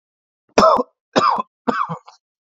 {"three_cough_length": "2.6 s", "three_cough_amplitude": 32768, "three_cough_signal_mean_std_ratio": 0.41, "survey_phase": "beta (2021-08-13 to 2022-03-07)", "age": "45-64", "gender": "Male", "wearing_mask": "No", "symptom_none": true, "smoker_status": "Never smoked", "respiratory_condition_asthma": false, "respiratory_condition_other": false, "recruitment_source": "REACT", "submission_delay": "1 day", "covid_test_result": "Negative", "covid_test_method": "RT-qPCR", "influenza_a_test_result": "Negative", "influenza_b_test_result": "Negative"}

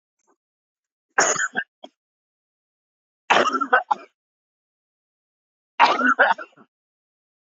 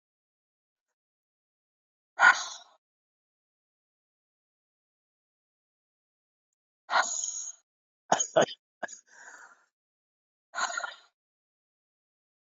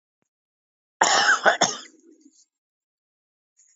{"three_cough_length": "7.5 s", "three_cough_amplitude": 26887, "three_cough_signal_mean_std_ratio": 0.31, "exhalation_length": "12.5 s", "exhalation_amplitude": 13866, "exhalation_signal_mean_std_ratio": 0.21, "cough_length": "3.8 s", "cough_amplitude": 27096, "cough_signal_mean_std_ratio": 0.32, "survey_phase": "beta (2021-08-13 to 2022-03-07)", "age": "45-64", "gender": "Male", "wearing_mask": "No", "symptom_cough_any": true, "symptom_runny_or_blocked_nose": true, "symptom_sore_throat": true, "symptom_fatigue": true, "smoker_status": "Current smoker (1 to 10 cigarettes per day)", "respiratory_condition_asthma": false, "respiratory_condition_other": false, "recruitment_source": "REACT", "submission_delay": "13 days", "covid_test_result": "Negative", "covid_test_method": "RT-qPCR", "influenza_a_test_result": "Unknown/Void", "influenza_b_test_result": "Unknown/Void"}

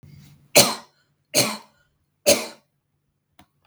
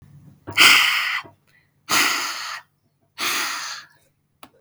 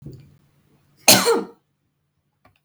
{"three_cough_length": "3.7 s", "three_cough_amplitude": 32768, "three_cough_signal_mean_std_ratio": 0.28, "exhalation_length": "4.6 s", "exhalation_amplitude": 32768, "exhalation_signal_mean_std_ratio": 0.45, "cough_length": "2.6 s", "cough_amplitude": 32768, "cough_signal_mean_std_ratio": 0.28, "survey_phase": "beta (2021-08-13 to 2022-03-07)", "age": "18-44", "gender": "Female", "wearing_mask": "No", "symptom_headache": true, "smoker_status": "Never smoked", "respiratory_condition_asthma": false, "respiratory_condition_other": false, "recruitment_source": "REACT", "submission_delay": "1 day", "covid_test_result": "Negative", "covid_test_method": "RT-qPCR"}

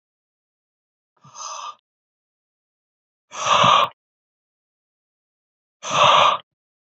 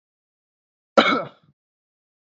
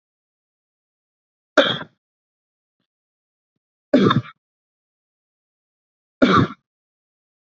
{"exhalation_length": "7.0 s", "exhalation_amplitude": 27245, "exhalation_signal_mean_std_ratio": 0.31, "cough_length": "2.2 s", "cough_amplitude": 27266, "cough_signal_mean_std_ratio": 0.24, "three_cough_length": "7.4 s", "three_cough_amplitude": 27249, "three_cough_signal_mean_std_ratio": 0.24, "survey_phase": "beta (2021-08-13 to 2022-03-07)", "age": "18-44", "gender": "Male", "wearing_mask": "No", "symptom_none": true, "symptom_onset": "8 days", "smoker_status": "Never smoked", "respiratory_condition_asthma": false, "respiratory_condition_other": false, "recruitment_source": "REACT", "submission_delay": "1 day", "covid_test_result": "Negative", "covid_test_method": "RT-qPCR"}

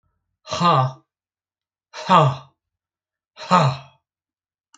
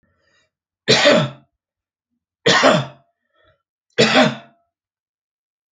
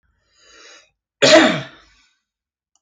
{"exhalation_length": "4.8 s", "exhalation_amplitude": 27898, "exhalation_signal_mean_std_ratio": 0.35, "three_cough_length": "5.7 s", "three_cough_amplitude": 30913, "three_cough_signal_mean_std_ratio": 0.36, "cough_length": "2.8 s", "cough_amplitude": 32767, "cough_signal_mean_std_ratio": 0.3, "survey_phase": "alpha (2021-03-01 to 2021-08-12)", "age": "45-64", "gender": "Male", "wearing_mask": "No", "symptom_none": true, "smoker_status": "Ex-smoker", "respiratory_condition_asthma": false, "respiratory_condition_other": false, "recruitment_source": "REACT", "submission_delay": "1 day", "covid_test_result": "Negative", "covid_test_method": "RT-qPCR"}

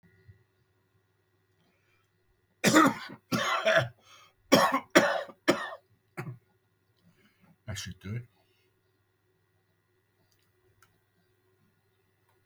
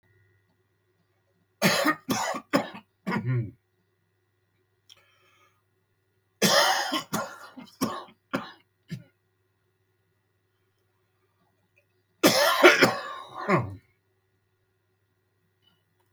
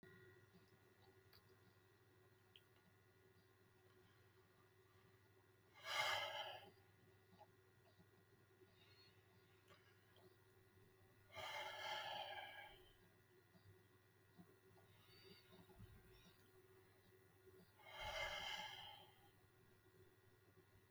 {"cough_length": "12.5 s", "cough_amplitude": 18901, "cough_signal_mean_std_ratio": 0.29, "three_cough_length": "16.1 s", "three_cough_amplitude": 29521, "three_cough_signal_mean_std_ratio": 0.33, "exhalation_length": "20.9 s", "exhalation_amplitude": 984, "exhalation_signal_mean_std_ratio": 0.45, "survey_phase": "beta (2021-08-13 to 2022-03-07)", "age": "65+", "gender": "Male", "wearing_mask": "No", "symptom_shortness_of_breath": true, "smoker_status": "Ex-smoker", "respiratory_condition_asthma": false, "respiratory_condition_other": true, "recruitment_source": "REACT", "submission_delay": "1 day", "covid_test_result": "Negative", "covid_test_method": "RT-qPCR", "influenza_a_test_result": "Negative", "influenza_b_test_result": "Negative"}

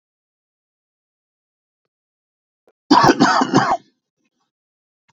{"cough_length": "5.1 s", "cough_amplitude": 32082, "cough_signal_mean_std_ratio": 0.3, "survey_phase": "beta (2021-08-13 to 2022-03-07)", "age": "45-64", "gender": "Male", "wearing_mask": "No", "symptom_shortness_of_breath": true, "symptom_abdominal_pain": true, "symptom_diarrhoea": true, "symptom_fatigue": true, "symptom_headache": true, "smoker_status": "Never smoked", "respiratory_condition_asthma": false, "respiratory_condition_other": false, "recruitment_source": "REACT", "submission_delay": "1 day", "covid_test_result": "Negative", "covid_test_method": "RT-qPCR"}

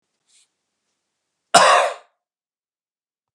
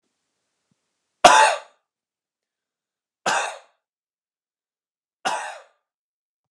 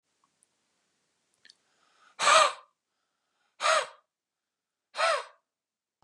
{"cough_length": "3.3 s", "cough_amplitude": 32767, "cough_signal_mean_std_ratio": 0.26, "three_cough_length": "6.5 s", "three_cough_amplitude": 32768, "three_cough_signal_mean_std_ratio": 0.23, "exhalation_length": "6.0 s", "exhalation_amplitude": 15747, "exhalation_signal_mean_std_ratio": 0.28, "survey_phase": "beta (2021-08-13 to 2022-03-07)", "age": "45-64", "gender": "Male", "wearing_mask": "No", "symptom_none": true, "smoker_status": "Never smoked", "respiratory_condition_asthma": true, "respiratory_condition_other": true, "recruitment_source": "REACT", "submission_delay": "2 days", "covid_test_result": "Negative", "covid_test_method": "RT-qPCR", "influenza_a_test_result": "Negative", "influenza_b_test_result": "Negative"}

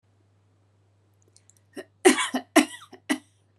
{"three_cough_length": "3.6 s", "three_cough_amplitude": 24810, "three_cough_signal_mean_std_ratio": 0.26, "survey_phase": "beta (2021-08-13 to 2022-03-07)", "age": "18-44", "gender": "Female", "wearing_mask": "No", "symptom_diarrhoea": true, "symptom_fatigue": true, "smoker_status": "Never smoked", "respiratory_condition_asthma": false, "respiratory_condition_other": false, "recruitment_source": "REACT", "submission_delay": "1 day", "covid_test_result": "Negative", "covid_test_method": "RT-qPCR"}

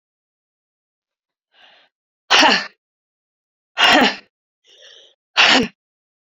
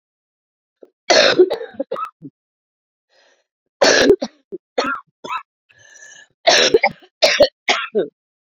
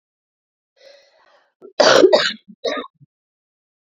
{"exhalation_length": "6.4 s", "exhalation_amplitude": 31984, "exhalation_signal_mean_std_ratio": 0.32, "three_cough_length": "8.4 s", "three_cough_amplitude": 32767, "three_cough_signal_mean_std_ratio": 0.39, "cough_length": "3.8 s", "cough_amplitude": 32768, "cough_signal_mean_std_ratio": 0.31, "survey_phase": "beta (2021-08-13 to 2022-03-07)", "age": "45-64", "gender": "Female", "wearing_mask": "No", "symptom_cough_any": true, "symptom_new_continuous_cough": true, "symptom_sore_throat": true, "symptom_fatigue": true, "symptom_headache": true, "symptom_onset": "2 days", "smoker_status": "Ex-smoker", "respiratory_condition_asthma": false, "respiratory_condition_other": false, "recruitment_source": "Test and Trace", "submission_delay": "2 days", "covid_test_result": "Positive", "covid_test_method": "RT-qPCR", "covid_ct_value": 19.5, "covid_ct_gene": "N gene", "covid_ct_mean": 19.6, "covid_viral_load": "360000 copies/ml", "covid_viral_load_category": "Low viral load (10K-1M copies/ml)"}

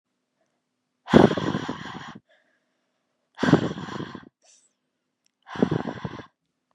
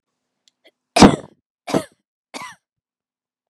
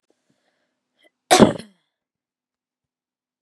{"exhalation_length": "6.7 s", "exhalation_amplitude": 30353, "exhalation_signal_mean_std_ratio": 0.29, "three_cough_length": "3.5 s", "three_cough_amplitude": 32768, "three_cough_signal_mean_std_ratio": 0.21, "cough_length": "3.4 s", "cough_amplitude": 32768, "cough_signal_mean_std_ratio": 0.18, "survey_phase": "beta (2021-08-13 to 2022-03-07)", "age": "18-44", "gender": "Female", "wearing_mask": "No", "symptom_abdominal_pain": true, "symptom_diarrhoea": true, "symptom_headache": true, "symptom_other": true, "symptom_onset": "3 days", "smoker_status": "Never smoked", "respiratory_condition_asthma": false, "respiratory_condition_other": false, "recruitment_source": "Test and Trace", "submission_delay": "1 day", "covid_test_result": "Positive", "covid_test_method": "RT-qPCR", "covid_ct_value": 28.6, "covid_ct_gene": "N gene"}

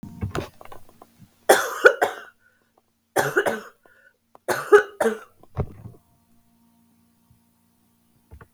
{"three_cough_length": "8.5 s", "three_cough_amplitude": 32768, "three_cough_signal_mean_std_ratio": 0.29, "survey_phase": "beta (2021-08-13 to 2022-03-07)", "age": "45-64", "gender": "Female", "wearing_mask": "No", "symptom_cough_any": true, "symptom_runny_or_blocked_nose": true, "symptom_sore_throat": true, "symptom_headache": true, "symptom_change_to_sense_of_smell_or_taste": true, "symptom_loss_of_taste": true, "symptom_onset": "6 days", "smoker_status": "Never smoked", "respiratory_condition_asthma": false, "respiratory_condition_other": false, "recruitment_source": "Test and Trace", "submission_delay": "2 days", "covid_test_result": "Positive", "covid_test_method": "RT-qPCR", "covid_ct_value": 12.5, "covid_ct_gene": "ORF1ab gene", "covid_ct_mean": 12.9, "covid_viral_load": "60000000 copies/ml", "covid_viral_load_category": "High viral load (>1M copies/ml)"}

